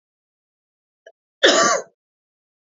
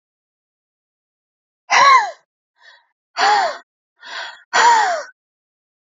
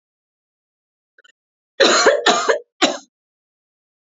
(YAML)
cough_length: 2.7 s
cough_amplitude: 28779
cough_signal_mean_std_ratio: 0.29
exhalation_length: 5.8 s
exhalation_amplitude: 29813
exhalation_signal_mean_std_ratio: 0.39
three_cough_length: 4.1 s
three_cough_amplitude: 29954
three_cough_signal_mean_std_ratio: 0.36
survey_phase: beta (2021-08-13 to 2022-03-07)
age: 18-44
gender: Female
wearing_mask: 'No'
symptom_none: true
smoker_status: Ex-smoker
respiratory_condition_asthma: false
respiratory_condition_other: false
recruitment_source: REACT
submission_delay: 1 day
covid_test_result: Negative
covid_test_method: RT-qPCR
influenza_a_test_result: Negative
influenza_b_test_result: Negative